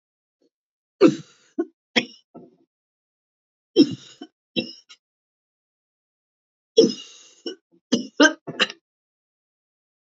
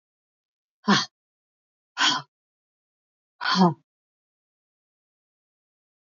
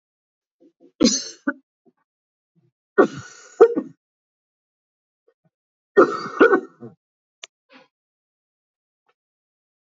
{"three_cough_length": "10.2 s", "three_cough_amplitude": 26392, "three_cough_signal_mean_std_ratio": 0.23, "exhalation_length": "6.1 s", "exhalation_amplitude": 15660, "exhalation_signal_mean_std_ratio": 0.25, "cough_length": "9.8 s", "cough_amplitude": 27564, "cough_signal_mean_std_ratio": 0.23, "survey_phase": "beta (2021-08-13 to 2022-03-07)", "age": "65+", "gender": "Female", "wearing_mask": "No", "symptom_cough_any": true, "symptom_runny_or_blocked_nose": true, "smoker_status": "Never smoked", "respiratory_condition_asthma": false, "respiratory_condition_other": false, "recruitment_source": "REACT", "submission_delay": "1 day", "covid_test_result": "Negative", "covid_test_method": "RT-qPCR", "influenza_a_test_result": "Unknown/Void", "influenza_b_test_result": "Unknown/Void"}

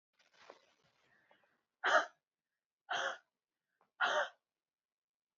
{"exhalation_length": "5.4 s", "exhalation_amplitude": 4542, "exhalation_signal_mean_std_ratio": 0.28, "survey_phase": "beta (2021-08-13 to 2022-03-07)", "age": "18-44", "gender": "Female", "wearing_mask": "No", "symptom_fatigue": true, "symptom_headache": true, "smoker_status": "Never smoked", "respiratory_condition_asthma": false, "respiratory_condition_other": false, "recruitment_source": "REACT", "submission_delay": "3 days", "covid_test_result": "Negative", "covid_test_method": "RT-qPCR", "influenza_a_test_result": "Negative", "influenza_b_test_result": "Negative"}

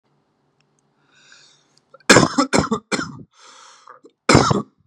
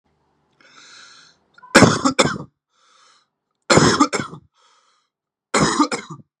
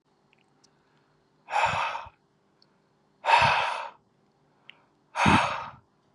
{"cough_length": "4.9 s", "cough_amplitude": 32768, "cough_signal_mean_std_ratio": 0.33, "three_cough_length": "6.4 s", "three_cough_amplitude": 32768, "three_cough_signal_mean_std_ratio": 0.35, "exhalation_length": "6.1 s", "exhalation_amplitude": 17648, "exhalation_signal_mean_std_ratio": 0.39, "survey_phase": "beta (2021-08-13 to 2022-03-07)", "age": "18-44", "gender": "Male", "wearing_mask": "No", "symptom_change_to_sense_of_smell_or_taste": true, "smoker_status": "Never smoked", "respiratory_condition_asthma": false, "respiratory_condition_other": false, "recruitment_source": "Test and Trace", "submission_delay": "1 day", "covid_test_result": "Positive", "covid_test_method": "RT-qPCR", "covid_ct_value": 23.8, "covid_ct_gene": "N gene", "covid_ct_mean": 24.0, "covid_viral_load": "14000 copies/ml", "covid_viral_load_category": "Low viral load (10K-1M copies/ml)"}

